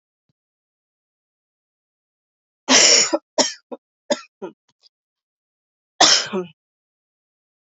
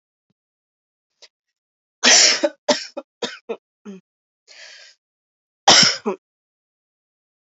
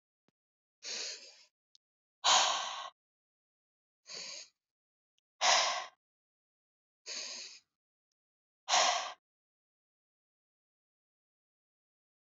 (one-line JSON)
{"three_cough_length": "7.7 s", "three_cough_amplitude": 32538, "three_cough_signal_mean_std_ratio": 0.28, "cough_length": "7.5 s", "cough_amplitude": 32767, "cough_signal_mean_std_ratio": 0.28, "exhalation_length": "12.3 s", "exhalation_amplitude": 10150, "exhalation_signal_mean_std_ratio": 0.29, "survey_phase": "alpha (2021-03-01 to 2021-08-12)", "age": "18-44", "gender": "Female", "wearing_mask": "No", "symptom_diarrhoea": true, "symptom_fatigue": true, "symptom_headache": true, "smoker_status": "Never smoked", "respiratory_condition_asthma": false, "respiratory_condition_other": false, "recruitment_source": "Test and Trace", "submission_delay": "3 days", "covid_test_result": "Positive", "covid_test_method": "LFT"}